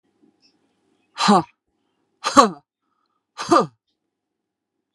{"exhalation_length": "4.9 s", "exhalation_amplitude": 32768, "exhalation_signal_mean_std_ratio": 0.26, "survey_phase": "beta (2021-08-13 to 2022-03-07)", "age": "45-64", "gender": "Female", "wearing_mask": "No", "symptom_none": true, "smoker_status": "Ex-smoker", "respiratory_condition_asthma": false, "respiratory_condition_other": false, "recruitment_source": "REACT", "submission_delay": "2 days", "covid_test_result": "Negative", "covid_test_method": "RT-qPCR", "influenza_a_test_result": "Negative", "influenza_b_test_result": "Negative"}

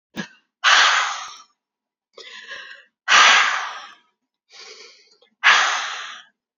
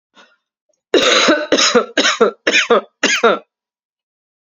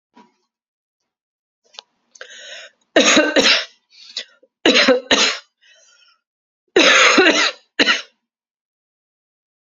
{"exhalation_length": "6.6 s", "exhalation_amplitude": 32768, "exhalation_signal_mean_std_ratio": 0.42, "cough_length": "4.4 s", "cough_amplitude": 32767, "cough_signal_mean_std_ratio": 0.53, "three_cough_length": "9.6 s", "three_cough_amplitude": 32767, "three_cough_signal_mean_std_ratio": 0.4, "survey_phase": "alpha (2021-03-01 to 2021-08-12)", "age": "18-44", "gender": "Female", "wearing_mask": "No", "symptom_cough_any": true, "symptom_shortness_of_breath": true, "symptom_fatigue": true, "symptom_headache": true, "symptom_change_to_sense_of_smell_or_taste": true, "symptom_onset": "4 days", "smoker_status": "Ex-smoker", "respiratory_condition_asthma": false, "respiratory_condition_other": false, "recruitment_source": "Test and Trace", "submission_delay": "1 day", "covid_test_result": "Positive", "covid_test_method": "RT-qPCR"}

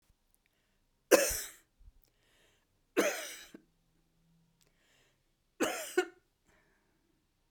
{"three_cough_length": "7.5 s", "three_cough_amplitude": 13699, "three_cough_signal_mean_std_ratio": 0.25, "survey_phase": "beta (2021-08-13 to 2022-03-07)", "age": "65+", "gender": "Female", "wearing_mask": "No", "symptom_new_continuous_cough": true, "symptom_runny_or_blocked_nose": true, "symptom_fatigue": true, "symptom_change_to_sense_of_smell_or_taste": true, "symptom_loss_of_taste": true, "symptom_onset": "3 days", "smoker_status": "Ex-smoker", "respiratory_condition_asthma": false, "respiratory_condition_other": false, "recruitment_source": "Test and Trace", "submission_delay": "2 days", "covid_test_result": "Positive", "covid_test_method": "RT-qPCR", "covid_ct_value": 16.4, "covid_ct_gene": "ORF1ab gene", "covid_ct_mean": 16.9, "covid_viral_load": "2900000 copies/ml", "covid_viral_load_category": "High viral load (>1M copies/ml)"}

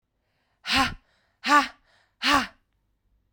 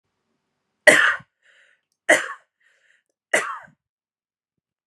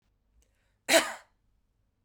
{"exhalation_length": "3.3 s", "exhalation_amplitude": 17590, "exhalation_signal_mean_std_ratio": 0.34, "three_cough_length": "4.9 s", "three_cough_amplitude": 32768, "three_cough_signal_mean_std_ratio": 0.25, "cough_length": "2.0 s", "cough_amplitude": 13007, "cough_signal_mean_std_ratio": 0.23, "survey_phase": "beta (2021-08-13 to 2022-03-07)", "age": "18-44", "gender": "Female", "wearing_mask": "No", "symptom_cough_any": true, "symptom_new_continuous_cough": true, "symptom_runny_or_blocked_nose": true, "symptom_headache": true, "symptom_change_to_sense_of_smell_or_taste": true, "symptom_loss_of_taste": true, "symptom_onset": "4 days", "smoker_status": "Current smoker (e-cigarettes or vapes only)", "respiratory_condition_asthma": false, "respiratory_condition_other": false, "recruitment_source": "Test and Trace", "submission_delay": "1 day", "covid_test_result": "Positive", "covid_test_method": "ePCR"}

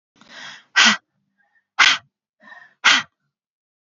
{"exhalation_length": "3.8 s", "exhalation_amplitude": 30277, "exhalation_signal_mean_std_ratio": 0.31, "survey_phase": "beta (2021-08-13 to 2022-03-07)", "age": "18-44", "gender": "Female", "wearing_mask": "No", "symptom_prefer_not_to_say": true, "smoker_status": "Current smoker (1 to 10 cigarettes per day)", "respiratory_condition_asthma": false, "respiratory_condition_other": false, "recruitment_source": "REACT", "submission_delay": "1 day", "covid_test_result": "Negative", "covid_test_method": "RT-qPCR", "influenza_a_test_result": "Negative", "influenza_b_test_result": "Negative"}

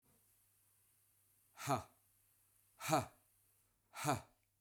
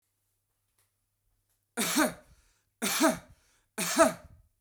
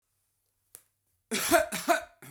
{"exhalation_length": "4.6 s", "exhalation_amplitude": 2807, "exhalation_signal_mean_std_ratio": 0.3, "three_cough_length": "4.6 s", "three_cough_amplitude": 11524, "three_cough_signal_mean_std_ratio": 0.36, "cough_length": "2.3 s", "cough_amplitude": 10821, "cough_signal_mean_std_ratio": 0.38, "survey_phase": "beta (2021-08-13 to 2022-03-07)", "age": "45-64", "gender": "Male", "wearing_mask": "No", "symptom_none": true, "smoker_status": "Never smoked", "respiratory_condition_asthma": false, "respiratory_condition_other": false, "recruitment_source": "REACT", "submission_delay": "1 day", "covid_test_result": "Negative", "covid_test_method": "RT-qPCR"}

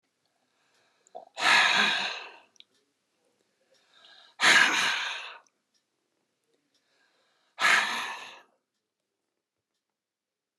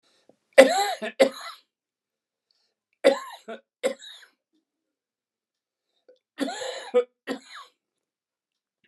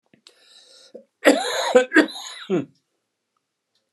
{"exhalation_length": "10.6 s", "exhalation_amplitude": 15172, "exhalation_signal_mean_std_ratio": 0.34, "three_cough_length": "8.9 s", "three_cough_amplitude": 29204, "three_cough_signal_mean_std_ratio": 0.25, "cough_length": "3.9 s", "cough_amplitude": 29157, "cough_signal_mean_std_ratio": 0.35, "survey_phase": "beta (2021-08-13 to 2022-03-07)", "age": "65+", "gender": "Male", "wearing_mask": "No", "symptom_none": true, "smoker_status": "Never smoked", "respiratory_condition_asthma": false, "respiratory_condition_other": false, "recruitment_source": "REACT", "submission_delay": "4 days", "covid_test_result": "Negative", "covid_test_method": "RT-qPCR", "influenza_a_test_result": "Negative", "influenza_b_test_result": "Negative"}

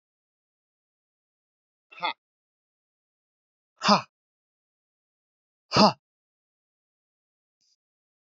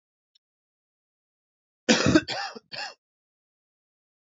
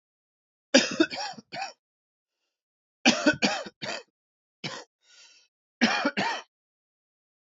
{"exhalation_length": "8.4 s", "exhalation_amplitude": 22666, "exhalation_signal_mean_std_ratio": 0.16, "cough_length": "4.4 s", "cough_amplitude": 21668, "cough_signal_mean_std_ratio": 0.25, "three_cough_length": "7.4 s", "three_cough_amplitude": 23589, "three_cough_signal_mean_std_ratio": 0.34, "survey_phase": "beta (2021-08-13 to 2022-03-07)", "age": "18-44", "gender": "Male", "wearing_mask": "No", "symptom_new_continuous_cough": true, "symptom_runny_or_blocked_nose": true, "symptom_fatigue": true, "symptom_onset": "8 days", "smoker_status": "Never smoked", "respiratory_condition_asthma": false, "respiratory_condition_other": false, "recruitment_source": "REACT", "submission_delay": "2 days", "covid_test_result": "Negative", "covid_test_method": "RT-qPCR", "influenza_a_test_result": "Negative", "influenza_b_test_result": "Negative"}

